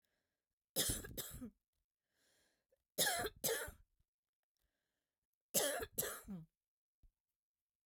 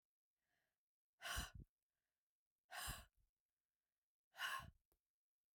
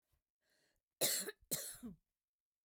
three_cough_length: 7.9 s
three_cough_amplitude: 3074
three_cough_signal_mean_std_ratio: 0.36
exhalation_length: 5.5 s
exhalation_amplitude: 631
exhalation_signal_mean_std_ratio: 0.32
cough_length: 2.6 s
cough_amplitude: 3120
cough_signal_mean_std_ratio: 0.35
survey_phase: beta (2021-08-13 to 2022-03-07)
age: 45-64
gender: Female
wearing_mask: 'No'
symptom_none: true
smoker_status: Never smoked
respiratory_condition_asthma: true
respiratory_condition_other: false
recruitment_source: REACT
submission_delay: 0 days
covid_test_result: Negative
covid_test_method: RT-qPCR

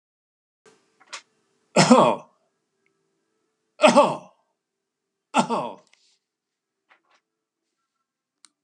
exhalation_length: 8.6 s
exhalation_amplitude: 29914
exhalation_signal_mean_std_ratio: 0.25
survey_phase: beta (2021-08-13 to 2022-03-07)
age: 65+
gender: Male
wearing_mask: 'No'
symptom_fatigue: true
symptom_onset: 12 days
smoker_status: Never smoked
respiratory_condition_asthma: false
respiratory_condition_other: false
recruitment_source: REACT
submission_delay: 6 days
covid_test_result: Negative
covid_test_method: RT-qPCR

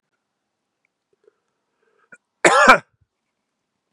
cough_length: 3.9 s
cough_amplitude: 32768
cough_signal_mean_std_ratio: 0.22
survey_phase: beta (2021-08-13 to 2022-03-07)
age: 45-64
gender: Male
wearing_mask: 'No'
symptom_runny_or_blocked_nose: true
symptom_abdominal_pain: true
symptom_fatigue: true
symptom_onset: 4 days
smoker_status: Never smoked
respiratory_condition_asthma: false
respiratory_condition_other: false
recruitment_source: Test and Trace
submission_delay: 1 day
covid_test_result: Positive
covid_test_method: RT-qPCR
covid_ct_value: 19.6
covid_ct_gene: ORF1ab gene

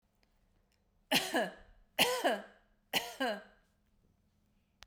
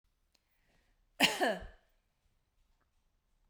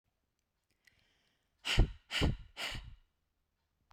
three_cough_length: 4.9 s
three_cough_amplitude: 6723
three_cough_signal_mean_std_ratio: 0.38
cough_length: 3.5 s
cough_amplitude: 7927
cough_signal_mean_std_ratio: 0.25
exhalation_length: 3.9 s
exhalation_amplitude: 7468
exhalation_signal_mean_std_ratio: 0.29
survey_phase: beta (2021-08-13 to 2022-03-07)
age: 45-64
gender: Female
wearing_mask: 'No'
symptom_none: true
smoker_status: Never smoked
respiratory_condition_asthma: false
respiratory_condition_other: false
recruitment_source: REACT
submission_delay: 1 day
covid_test_result: Negative
covid_test_method: RT-qPCR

